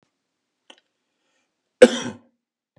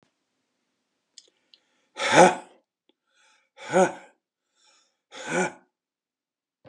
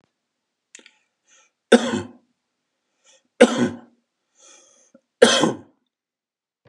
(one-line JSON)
{"cough_length": "2.8 s", "cough_amplitude": 32768, "cough_signal_mean_std_ratio": 0.15, "exhalation_length": "6.7 s", "exhalation_amplitude": 28144, "exhalation_signal_mean_std_ratio": 0.24, "three_cough_length": "6.7 s", "three_cough_amplitude": 32768, "three_cough_signal_mean_std_ratio": 0.24, "survey_phase": "beta (2021-08-13 to 2022-03-07)", "age": "65+", "gender": "Male", "wearing_mask": "No", "symptom_runny_or_blocked_nose": true, "smoker_status": "Ex-smoker", "respiratory_condition_asthma": false, "respiratory_condition_other": false, "recruitment_source": "REACT", "submission_delay": "2 days", "covid_test_result": "Negative", "covid_test_method": "RT-qPCR", "influenza_a_test_result": "Negative", "influenza_b_test_result": "Negative"}